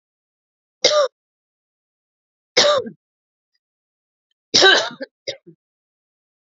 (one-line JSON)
{"three_cough_length": "6.5 s", "three_cough_amplitude": 30247, "three_cough_signal_mean_std_ratio": 0.29, "survey_phase": "beta (2021-08-13 to 2022-03-07)", "age": "45-64", "gender": "Female", "wearing_mask": "No", "symptom_cough_any": true, "symptom_sore_throat": true, "symptom_headache": true, "symptom_change_to_sense_of_smell_or_taste": true, "smoker_status": "Ex-smoker", "respiratory_condition_asthma": false, "respiratory_condition_other": false, "recruitment_source": "Test and Trace", "submission_delay": "1 day", "covid_test_result": "Positive", "covid_test_method": "RT-qPCR", "covid_ct_value": 33.4, "covid_ct_gene": "ORF1ab gene", "covid_ct_mean": 34.1, "covid_viral_load": "6.6 copies/ml", "covid_viral_load_category": "Minimal viral load (< 10K copies/ml)"}